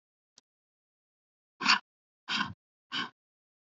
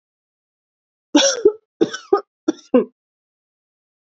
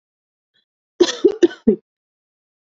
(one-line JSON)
{"exhalation_length": "3.7 s", "exhalation_amplitude": 12943, "exhalation_signal_mean_std_ratio": 0.25, "three_cough_length": "4.0 s", "three_cough_amplitude": 27394, "three_cough_signal_mean_std_ratio": 0.3, "cough_length": "2.7 s", "cough_amplitude": 27530, "cough_signal_mean_std_ratio": 0.26, "survey_phase": "alpha (2021-03-01 to 2021-08-12)", "age": "18-44", "gender": "Female", "wearing_mask": "No", "symptom_cough_any": true, "symptom_change_to_sense_of_smell_or_taste": true, "symptom_loss_of_taste": true, "symptom_onset": "4 days", "smoker_status": "Never smoked", "respiratory_condition_asthma": false, "respiratory_condition_other": false, "recruitment_source": "Test and Trace", "submission_delay": "2 days", "covid_test_result": "Positive", "covid_test_method": "RT-qPCR", "covid_ct_value": 19.1, "covid_ct_gene": "ORF1ab gene", "covid_ct_mean": 20.2, "covid_viral_load": "240000 copies/ml", "covid_viral_load_category": "Low viral load (10K-1M copies/ml)"}